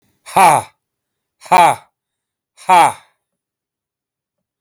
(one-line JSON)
{"exhalation_length": "4.6 s", "exhalation_amplitude": 32768, "exhalation_signal_mean_std_ratio": 0.33, "survey_phase": "alpha (2021-03-01 to 2021-08-12)", "age": "45-64", "gender": "Male", "wearing_mask": "No", "symptom_none": true, "smoker_status": "Never smoked", "respiratory_condition_asthma": true, "respiratory_condition_other": false, "recruitment_source": "REACT", "submission_delay": "2 days", "covid_test_method": "RT-qPCR"}